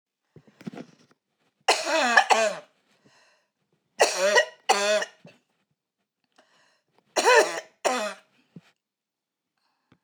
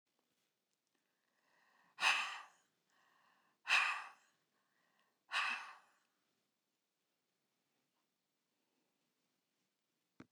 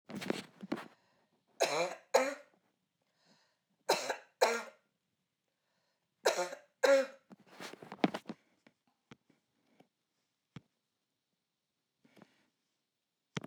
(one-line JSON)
{"cough_length": "10.0 s", "cough_amplitude": 24171, "cough_signal_mean_std_ratio": 0.36, "exhalation_length": "10.3 s", "exhalation_amplitude": 3679, "exhalation_signal_mean_std_ratio": 0.24, "three_cough_length": "13.5 s", "three_cough_amplitude": 6576, "three_cough_signal_mean_std_ratio": 0.28, "survey_phase": "alpha (2021-03-01 to 2021-08-12)", "age": "65+", "gender": "Female", "wearing_mask": "No", "symptom_none": true, "symptom_cough_any": true, "smoker_status": "Ex-smoker", "respiratory_condition_asthma": true, "respiratory_condition_other": false, "recruitment_source": "REACT", "submission_delay": "1 day", "covid_test_result": "Negative", "covid_test_method": "RT-qPCR"}